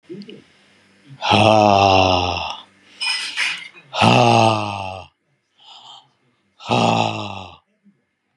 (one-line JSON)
{"exhalation_length": "8.4 s", "exhalation_amplitude": 32173, "exhalation_signal_mean_std_ratio": 0.5, "survey_phase": "beta (2021-08-13 to 2022-03-07)", "age": "45-64", "gender": "Male", "wearing_mask": "No", "symptom_none": true, "smoker_status": "Ex-smoker", "respiratory_condition_asthma": false, "respiratory_condition_other": false, "recruitment_source": "REACT", "submission_delay": "2 days", "covid_test_result": "Negative", "covid_test_method": "RT-qPCR"}